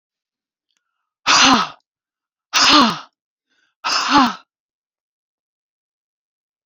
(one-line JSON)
{"exhalation_length": "6.7 s", "exhalation_amplitude": 31432, "exhalation_signal_mean_std_ratio": 0.35, "survey_phase": "beta (2021-08-13 to 2022-03-07)", "age": "45-64", "gender": "Female", "wearing_mask": "No", "symptom_none": true, "smoker_status": "Ex-smoker", "respiratory_condition_asthma": false, "respiratory_condition_other": false, "recruitment_source": "REACT", "submission_delay": "2 days", "covid_test_result": "Negative", "covid_test_method": "RT-qPCR"}